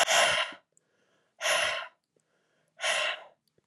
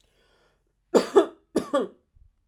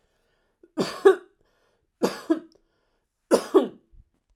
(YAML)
exhalation_length: 3.7 s
exhalation_amplitude: 9134
exhalation_signal_mean_std_ratio: 0.48
cough_length: 2.5 s
cough_amplitude: 19760
cough_signal_mean_std_ratio: 0.31
three_cough_length: 4.4 s
three_cough_amplitude: 24111
three_cough_signal_mean_std_ratio: 0.28
survey_phase: alpha (2021-03-01 to 2021-08-12)
age: 18-44
gender: Female
wearing_mask: 'No'
symptom_none: true
smoker_status: Never smoked
respiratory_condition_asthma: false
respiratory_condition_other: false
recruitment_source: REACT
submission_delay: 1 day
covid_test_result: Negative
covid_test_method: RT-qPCR